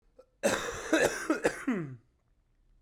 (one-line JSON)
{"cough_length": "2.8 s", "cough_amplitude": 8298, "cough_signal_mean_std_ratio": 0.51, "survey_phase": "beta (2021-08-13 to 2022-03-07)", "age": "18-44", "gender": "Male", "wearing_mask": "No", "symptom_new_continuous_cough": true, "symptom_sore_throat": true, "symptom_fatigue": true, "symptom_headache": true, "symptom_change_to_sense_of_smell_or_taste": true, "symptom_loss_of_taste": true, "symptom_other": true, "symptom_onset": "3 days", "smoker_status": "Never smoked", "respiratory_condition_asthma": false, "respiratory_condition_other": false, "recruitment_source": "Test and Trace", "submission_delay": "1 day", "covid_test_result": "Positive", "covid_test_method": "RT-qPCR", "covid_ct_value": 20.7, "covid_ct_gene": "ORF1ab gene", "covid_ct_mean": 21.3, "covid_viral_load": "100000 copies/ml", "covid_viral_load_category": "Low viral load (10K-1M copies/ml)"}